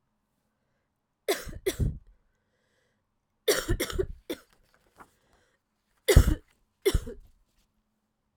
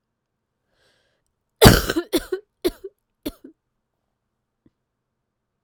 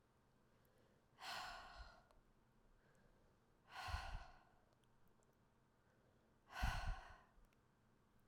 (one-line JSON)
{"three_cough_length": "8.4 s", "three_cough_amplitude": 21549, "three_cough_signal_mean_std_ratio": 0.27, "cough_length": "5.6 s", "cough_amplitude": 32768, "cough_signal_mean_std_ratio": 0.2, "exhalation_length": "8.3 s", "exhalation_amplitude": 997, "exhalation_signal_mean_std_ratio": 0.4, "survey_phase": "alpha (2021-03-01 to 2021-08-12)", "age": "18-44", "gender": "Female", "wearing_mask": "No", "symptom_cough_any": true, "symptom_fatigue": true, "symptom_headache": true, "symptom_change_to_sense_of_smell_or_taste": true, "symptom_loss_of_taste": true, "symptom_onset": "5 days", "smoker_status": "Ex-smoker", "respiratory_condition_asthma": false, "respiratory_condition_other": false, "recruitment_source": "Test and Trace", "submission_delay": "1 day", "covid_test_result": "Positive", "covid_test_method": "RT-qPCR", "covid_ct_value": 27.5, "covid_ct_gene": "N gene"}